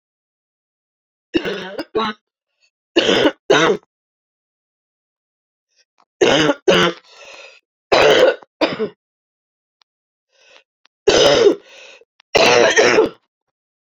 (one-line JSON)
{"three_cough_length": "14.0 s", "three_cough_amplitude": 32767, "three_cough_signal_mean_std_ratio": 0.41, "survey_phase": "beta (2021-08-13 to 2022-03-07)", "age": "45-64", "gender": "Female", "wearing_mask": "No", "symptom_cough_any": true, "symptom_runny_or_blocked_nose": true, "symptom_sore_throat": true, "symptom_abdominal_pain": true, "symptom_headache": true, "symptom_change_to_sense_of_smell_or_taste": true, "symptom_loss_of_taste": true, "symptom_onset": "3 days", "smoker_status": "Never smoked", "respiratory_condition_asthma": false, "respiratory_condition_other": false, "recruitment_source": "Test and Trace", "submission_delay": "2 days", "covid_test_result": "Positive", "covid_test_method": "RT-qPCR", "covid_ct_value": 16.9, "covid_ct_gene": "N gene", "covid_ct_mean": 17.8, "covid_viral_load": "1400000 copies/ml", "covid_viral_load_category": "High viral load (>1M copies/ml)"}